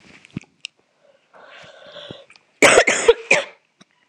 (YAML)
cough_length: 4.1 s
cough_amplitude: 26028
cough_signal_mean_std_ratio: 0.31
survey_phase: beta (2021-08-13 to 2022-03-07)
age: 18-44
gender: Female
wearing_mask: 'No'
symptom_cough_any: true
symptom_runny_or_blocked_nose: true
symptom_sore_throat: true
symptom_headache: true
smoker_status: Never smoked
respiratory_condition_asthma: false
respiratory_condition_other: false
recruitment_source: Test and Trace
submission_delay: 2 days
covid_test_result: Positive
covid_test_method: RT-qPCR